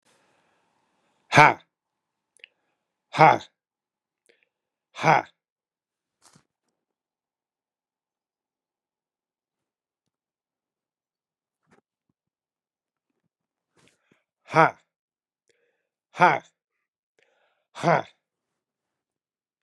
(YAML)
exhalation_length: 19.6 s
exhalation_amplitude: 32767
exhalation_signal_mean_std_ratio: 0.16
survey_phase: beta (2021-08-13 to 2022-03-07)
age: 65+
gender: Male
wearing_mask: 'No'
symptom_runny_or_blocked_nose: true
symptom_change_to_sense_of_smell_or_taste: true
symptom_other: true
smoker_status: Never smoked
respiratory_condition_asthma: false
respiratory_condition_other: false
recruitment_source: Test and Trace
submission_delay: 1 day
covid_test_result: Positive
covid_test_method: RT-qPCR
covid_ct_value: 21.8
covid_ct_gene: ORF1ab gene
covid_ct_mean: 22.4
covid_viral_load: 46000 copies/ml
covid_viral_load_category: Low viral load (10K-1M copies/ml)